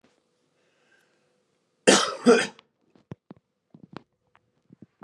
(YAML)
cough_length: 5.0 s
cough_amplitude: 27919
cough_signal_mean_std_ratio: 0.23
survey_phase: beta (2021-08-13 to 2022-03-07)
age: 18-44
gender: Male
wearing_mask: 'No'
symptom_cough_any: true
symptom_sore_throat: true
symptom_fatigue: true
symptom_headache: true
symptom_onset: 2 days
smoker_status: Never smoked
respiratory_condition_asthma: false
respiratory_condition_other: false
recruitment_source: Test and Trace
submission_delay: 1 day
covid_test_result: Positive
covid_test_method: ePCR